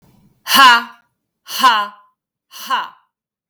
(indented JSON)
{
  "exhalation_length": "3.5 s",
  "exhalation_amplitude": 32768,
  "exhalation_signal_mean_std_ratio": 0.38,
  "survey_phase": "beta (2021-08-13 to 2022-03-07)",
  "age": "45-64",
  "gender": "Female",
  "wearing_mask": "No",
  "symptom_none": true,
  "symptom_onset": "12 days",
  "smoker_status": "Ex-smoker",
  "respiratory_condition_asthma": false,
  "respiratory_condition_other": false,
  "recruitment_source": "REACT",
  "submission_delay": "2 days",
  "covid_test_result": "Negative",
  "covid_test_method": "RT-qPCR",
  "influenza_a_test_result": "Unknown/Void",
  "influenza_b_test_result": "Unknown/Void"
}